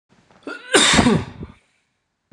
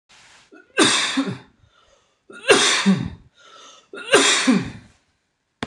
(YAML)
cough_length: 2.3 s
cough_amplitude: 26028
cough_signal_mean_std_ratio: 0.42
three_cough_length: 5.7 s
three_cough_amplitude: 26028
three_cough_signal_mean_std_ratio: 0.46
survey_phase: beta (2021-08-13 to 2022-03-07)
age: 18-44
gender: Male
wearing_mask: 'No'
symptom_fatigue: true
symptom_headache: true
symptom_onset: 6 days
smoker_status: Never smoked
respiratory_condition_asthma: false
respiratory_condition_other: false
recruitment_source: REACT
submission_delay: 1 day
covid_test_result: Negative
covid_test_method: RT-qPCR
influenza_a_test_result: Unknown/Void
influenza_b_test_result: Unknown/Void